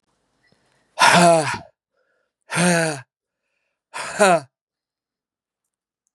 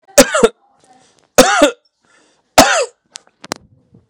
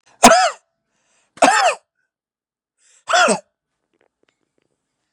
{"exhalation_length": "6.1 s", "exhalation_amplitude": 31013, "exhalation_signal_mean_std_ratio": 0.35, "three_cough_length": "4.1 s", "three_cough_amplitude": 32768, "three_cough_signal_mean_std_ratio": 0.35, "cough_length": "5.1 s", "cough_amplitude": 32768, "cough_signal_mean_std_ratio": 0.32, "survey_phase": "beta (2021-08-13 to 2022-03-07)", "age": "18-44", "gender": "Male", "wearing_mask": "No", "symptom_none": true, "smoker_status": "Never smoked", "respiratory_condition_asthma": false, "respiratory_condition_other": false, "recruitment_source": "REACT", "submission_delay": "1 day", "covid_test_result": "Negative", "covid_test_method": "RT-qPCR", "influenza_a_test_result": "Negative", "influenza_b_test_result": "Negative"}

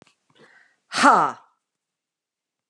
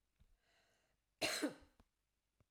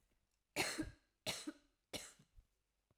{"exhalation_length": "2.7 s", "exhalation_amplitude": 28061, "exhalation_signal_mean_std_ratio": 0.28, "cough_length": "2.5 s", "cough_amplitude": 1697, "cough_signal_mean_std_ratio": 0.29, "three_cough_length": "3.0 s", "three_cough_amplitude": 2022, "three_cough_signal_mean_std_ratio": 0.37, "survey_phase": "alpha (2021-03-01 to 2021-08-12)", "age": "45-64", "gender": "Female", "wearing_mask": "No", "symptom_none": true, "smoker_status": "Never smoked", "respiratory_condition_asthma": false, "respiratory_condition_other": false, "recruitment_source": "REACT", "submission_delay": "5 days", "covid_test_result": "Negative", "covid_test_method": "RT-qPCR"}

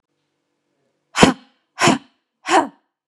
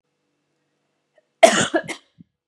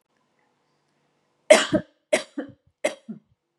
{"exhalation_length": "3.1 s", "exhalation_amplitude": 32768, "exhalation_signal_mean_std_ratio": 0.3, "cough_length": "2.5 s", "cough_amplitude": 32768, "cough_signal_mean_std_ratio": 0.25, "three_cough_length": "3.6 s", "three_cough_amplitude": 32018, "three_cough_signal_mean_std_ratio": 0.24, "survey_phase": "beta (2021-08-13 to 2022-03-07)", "age": "18-44", "gender": "Female", "wearing_mask": "No", "symptom_other": true, "smoker_status": "Ex-smoker", "respiratory_condition_asthma": false, "respiratory_condition_other": false, "recruitment_source": "REACT", "submission_delay": "1 day", "covid_test_result": "Negative", "covid_test_method": "RT-qPCR", "influenza_a_test_result": "Negative", "influenza_b_test_result": "Negative"}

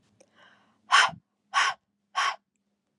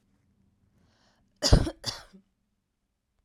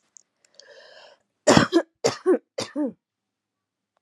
{"exhalation_length": "3.0 s", "exhalation_amplitude": 15310, "exhalation_signal_mean_std_ratio": 0.33, "cough_length": "3.2 s", "cough_amplitude": 22124, "cough_signal_mean_std_ratio": 0.21, "three_cough_length": "4.0 s", "three_cough_amplitude": 32767, "three_cough_signal_mean_std_ratio": 0.31, "survey_phase": "alpha (2021-03-01 to 2021-08-12)", "age": "18-44", "gender": "Female", "wearing_mask": "No", "symptom_none": true, "smoker_status": "Ex-smoker", "respiratory_condition_asthma": true, "respiratory_condition_other": false, "recruitment_source": "REACT", "submission_delay": "1 day", "covid_test_result": "Negative", "covid_test_method": "RT-qPCR"}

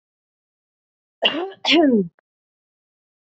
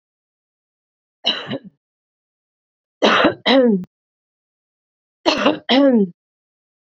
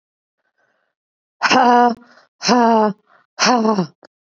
{"cough_length": "3.3 s", "cough_amplitude": 26348, "cough_signal_mean_std_ratio": 0.35, "three_cough_length": "7.0 s", "three_cough_amplitude": 31081, "three_cough_signal_mean_std_ratio": 0.38, "exhalation_length": "4.4 s", "exhalation_amplitude": 28154, "exhalation_signal_mean_std_ratio": 0.46, "survey_phase": "beta (2021-08-13 to 2022-03-07)", "age": "45-64", "gender": "Female", "wearing_mask": "No", "symptom_none": true, "symptom_onset": "11 days", "smoker_status": "Current smoker (1 to 10 cigarettes per day)", "respiratory_condition_asthma": false, "respiratory_condition_other": false, "recruitment_source": "REACT", "submission_delay": "2 days", "covid_test_result": "Negative", "covid_test_method": "RT-qPCR", "influenza_a_test_result": "Negative", "influenza_b_test_result": "Negative"}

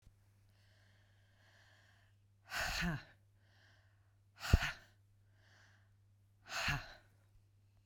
{"exhalation_length": "7.9 s", "exhalation_amplitude": 5607, "exhalation_signal_mean_std_ratio": 0.29, "survey_phase": "beta (2021-08-13 to 2022-03-07)", "age": "45-64", "gender": "Female", "wearing_mask": "No", "symptom_none": true, "symptom_onset": "8 days", "smoker_status": "Ex-smoker", "respiratory_condition_asthma": false, "respiratory_condition_other": false, "recruitment_source": "REACT", "submission_delay": "1 day", "covid_test_result": "Negative", "covid_test_method": "RT-qPCR"}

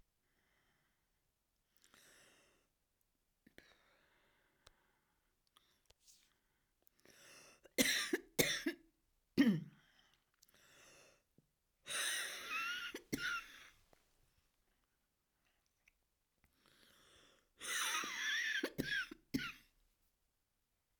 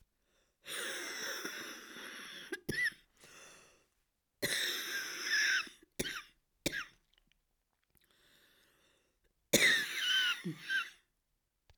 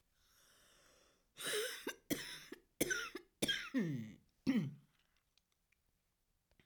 {"three_cough_length": "21.0 s", "three_cough_amplitude": 6745, "three_cough_signal_mean_std_ratio": 0.33, "exhalation_length": "11.8 s", "exhalation_amplitude": 9503, "exhalation_signal_mean_std_ratio": 0.46, "cough_length": "6.7 s", "cough_amplitude": 2903, "cough_signal_mean_std_ratio": 0.43, "survey_phase": "alpha (2021-03-01 to 2021-08-12)", "age": "65+", "gender": "Female", "wearing_mask": "No", "symptom_cough_any": true, "symptom_onset": "13 days", "smoker_status": "Ex-smoker", "respiratory_condition_asthma": true, "respiratory_condition_other": true, "recruitment_source": "REACT", "submission_delay": "1 day", "covid_test_result": "Negative", "covid_test_method": "RT-qPCR"}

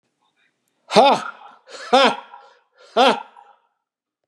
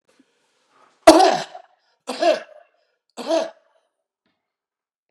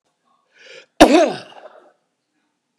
{"exhalation_length": "4.3 s", "exhalation_amplitude": 32767, "exhalation_signal_mean_std_ratio": 0.34, "three_cough_length": "5.1 s", "three_cough_amplitude": 32768, "three_cough_signal_mean_std_ratio": 0.27, "cough_length": "2.8 s", "cough_amplitude": 32768, "cough_signal_mean_std_ratio": 0.27, "survey_phase": "beta (2021-08-13 to 2022-03-07)", "age": "65+", "gender": "Male", "wearing_mask": "No", "symptom_shortness_of_breath": true, "symptom_fatigue": true, "smoker_status": "Ex-smoker", "respiratory_condition_asthma": false, "respiratory_condition_other": false, "recruitment_source": "REACT", "submission_delay": "1 day", "covid_test_result": "Negative", "covid_test_method": "RT-qPCR", "influenza_a_test_result": "Negative", "influenza_b_test_result": "Negative"}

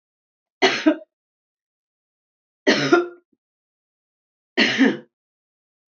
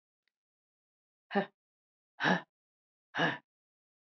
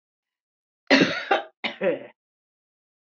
{"three_cough_length": "6.0 s", "three_cough_amplitude": 26127, "three_cough_signal_mean_std_ratio": 0.32, "exhalation_length": "4.1 s", "exhalation_amplitude": 6575, "exhalation_signal_mean_std_ratio": 0.27, "cough_length": "3.2 s", "cough_amplitude": 22052, "cough_signal_mean_std_ratio": 0.34, "survey_phase": "beta (2021-08-13 to 2022-03-07)", "age": "65+", "gender": "Female", "wearing_mask": "No", "symptom_fatigue": true, "symptom_headache": true, "symptom_onset": "12 days", "smoker_status": "Ex-smoker", "respiratory_condition_asthma": false, "respiratory_condition_other": false, "recruitment_source": "REACT", "submission_delay": "6 days", "covid_test_result": "Negative", "covid_test_method": "RT-qPCR", "influenza_a_test_result": "Negative", "influenza_b_test_result": "Negative"}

